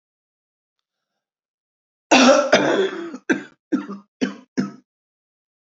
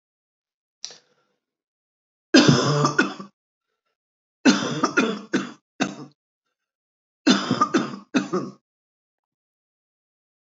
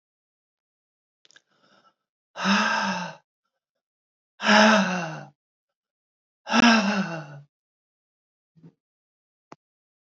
{"cough_length": "5.6 s", "cough_amplitude": 28436, "cough_signal_mean_std_ratio": 0.36, "three_cough_length": "10.6 s", "three_cough_amplitude": 26626, "three_cough_signal_mean_std_ratio": 0.35, "exhalation_length": "10.2 s", "exhalation_amplitude": 20687, "exhalation_signal_mean_std_ratio": 0.34, "survey_phase": "beta (2021-08-13 to 2022-03-07)", "age": "65+", "gender": "Female", "wearing_mask": "No", "symptom_cough_any": true, "symptom_runny_or_blocked_nose": true, "symptom_fatigue": true, "symptom_headache": true, "symptom_change_to_sense_of_smell_or_taste": true, "symptom_onset": "4 days", "smoker_status": "Never smoked", "respiratory_condition_asthma": false, "respiratory_condition_other": false, "recruitment_source": "Test and Trace", "submission_delay": "2 days", "covid_test_result": "Positive", "covid_test_method": "RT-qPCR", "covid_ct_value": 36.1, "covid_ct_gene": "ORF1ab gene"}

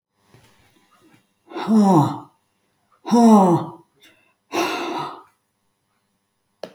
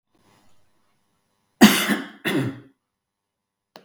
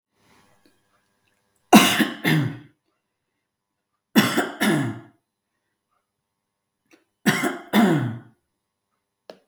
{"exhalation_length": "6.7 s", "exhalation_amplitude": 25094, "exhalation_signal_mean_std_ratio": 0.39, "cough_length": "3.8 s", "cough_amplitude": 32768, "cough_signal_mean_std_ratio": 0.27, "three_cough_length": "9.5 s", "three_cough_amplitude": 32768, "three_cough_signal_mean_std_ratio": 0.34, "survey_phase": "beta (2021-08-13 to 2022-03-07)", "age": "65+", "gender": "Female", "wearing_mask": "No", "symptom_none": true, "smoker_status": "Ex-smoker", "respiratory_condition_asthma": false, "respiratory_condition_other": false, "recruitment_source": "REACT", "submission_delay": "2 days", "covid_test_result": "Negative", "covid_test_method": "RT-qPCR", "influenza_a_test_result": "Unknown/Void", "influenza_b_test_result": "Unknown/Void"}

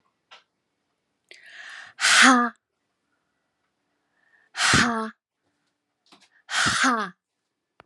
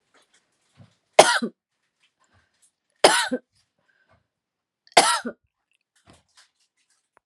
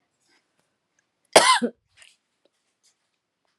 {"exhalation_length": "7.9 s", "exhalation_amplitude": 24524, "exhalation_signal_mean_std_ratio": 0.34, "three_cough_length": "7.3 s", "three_cough_amplitude": 32768, "three_cough_signal_mean_std_ratio": 0.22, "cough_length": "3.6 s", "cough_amplitude": 32767, "cough_signal_mean_std_ratio": 0.21, "survey_phase": "beta (2021-08-13 to 2022-03-07)", "age": "45-64", "gender": "Female", "wearing_mask": "No", "symptom_cough_any": true, "symptom_runny_or_blocked_nose": true, "symptom_sore_throat": true, "symptom_diarrhoea": true, "symptom_fatigue": true, "symptom_fever_high_temperature": true, "symptom_headache": true, "symptom_change_to_sense_of_smell_or_taste": true, "symptom_loss_of_taste": true, "symptom_onset": "5 days", "smoker_status": "Never smoked", "respiratory_condition_asthma": false, "respiratory_condition_other": false, "recruitment_source": "Test and Trace", "submission_delay": "2 days", "covid_test_result": "Positive", "covid_test_method": "RT-qPCR", "covid_ct_value": 34.4, "covid_ct_gene": "ORF1ab gene"}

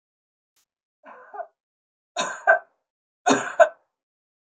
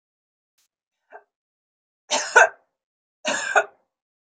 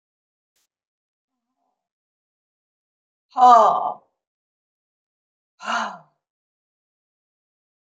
{"three_cough_length": "4.4 s", "three_cough_amplitude": 24870, "three_cough_signal_mean_std_ratio": 0.26, "cough_length": "4.3 s", "cough_amplitude": 27546, "cough_signal_mean_std_ratio": 0.25, "exhalation_length": "7.9 s", "exhalation_amplitude": 30009, "exhalation_signal_mean_std_ratio": 0.21, "survey_phase": "beta (2021-08-13 to 2022-03-07)", "age": "65+", "gender": "Female", "wearing_mask": "No", "symptom_none": true, "smoker_status": "Ex-smoker", "respiratory_condition_asthma": false, "respiratory_condition_other": false, "recruitment_source": "REACT", "submission_delay": "1 day", "covid_test_result": "Negative", "covid_test_method": "RT-qPCR"}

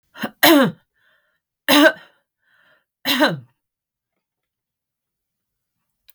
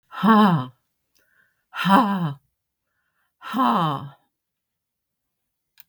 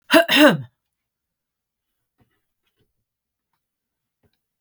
{"three_cough_length": "6.1 s", "three_cough_amplitude": 32768, "three_cough_signal_mean_std_ratio": 0.29, "exhalation_length": "5.9 s", "exhalation_amplitude": 21000, "exhalation_signal_mean_std_ratio": 0.41, "cough_length": "4.6 s", "cough_amplitude": 32768, "cough_signal_mean_std_ratio": 0.23, "survey_phase": "beta (2021-08-13 to 2022-03-07)", "age": "65+", "gender": "Female", "wearing_mask": "No", "symptom_cough_any": true, "smoker_status": "Ex-smoker", "respiratory_condition_asthma": false, "respiratory_condition_other": true, "recruitment_source": "REACT", "submission_delay": "2 days", "covid_test_result": "Negative", "covid_test_method": "RT-qPCR", "influenza_a_test_result": "Negative", "influenza_b_test_result": "Negative"}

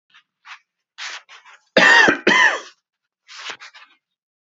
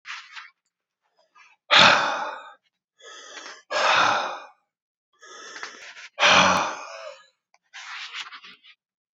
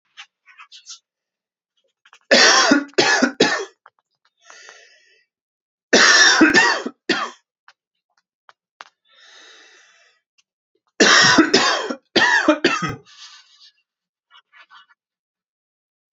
{"cough_length": "4.5 s", "cough_amplitude": 28855, "cough_signal_mean_std_ratio": 0.35, "exhalation_length": "9.1 s", "exhalation_amplitude": 29241, "exhalation_signal_mean_std_ratio": 0.38, "three_cough_length": "16.1 s", "three_cough_amplitude": 32768, "three_cough_signal_mean_std_ratio": 0.38, "survey_phase": "beta (2021-08-13 to 2022-03-07)", "age": "45-64", "gender": "Male", "wearing_mask": "No", "symptom_cough_any": true, "symptom_fatigue": true, "symptom_change_to_sense_of_smell_or_taste": true, "symptom_loss_of_taste": true, "symptom_onset": "3 days", "smoker_status": "Never smoked", "respiratory_condition_asthma": false, "respiratory_condition_other": false, "recruitment_source": "Test and Trace", "submission_delay": "1 day", "covid_test_result": "Positive", "covid_test_method": "RT-qPCR", "covid_ct_value": 23.9, "covid_ct_gene": "S gene"}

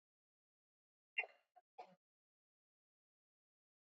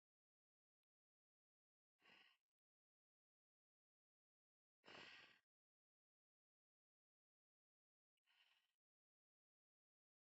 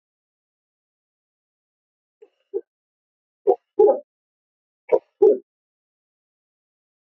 {"cough_length": "3.8 s", "cough_amplitude": 1419, "cough_signal_mean_std_ratio": 0.13, "exhalation_length": "10.2 s", "exhalation_amplitude": 120, "exhalation_signal_mean_std_ratio": 0.21, "three_cough_length": "7.1 s", "three_cough_amplitude": 19523, "three_cough_signal_mean_std_ratio": 0.21, "survey_phase": "beta (2021-08-13 to 2022-03-07)", "age": "18-44", "gender": "Female", "wearing_mask": "No", "symptom_runny_or_blocked_nose": true, "symptom_sore_throat": true, "symptom_onset": "4 days", "smoker_status": "Never smoked", "respiratory_condition_asthma": false, "respiratory_condition_other": false, "recruitment_source": "Test and Trace", "submission_delay": "2 days", "covid_test_result": "Positive", "covid_test_method": "RT-qPCR", "covid_ct_value": 12.3, "covid_ct_gene": "N gene", "covid_ct_mean": 12.7, "covid_viral_load": "68000000 copies/ml", "covid_viral_load_category": "High viral load (>1M copies/ml)"}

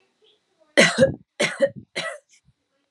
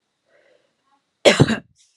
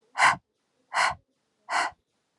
{"three_cough_length": "2.9 s", "three_cough_amplitude": 27604, "three_cough_signal_mean_std_ratio": 0.35, "cough_length": "2.0 s", "cough_amplitude": 32768, "cough_signal_mean_std_ratio": 0.27, "exhalation_length": "2.4 s", "exhalation_amplitude": 14277, "exhalation_signal_mean_std_ratio": 0.38, "survey_phase": "beta (2021-08-13 to 2022-03-07)", "age": "45-64", "gender": "Female", "wearing_mask": "No", "symptom_none": true, "smoker_status": "Never smoked", "respiratory_condition_asthma": true, "respiratory_condition_other": false, "recruitment_source": "REACT", "submission_delay": "2 days", "covid_test_result": "Negative", "covid_test_method": "RT-qPCR"}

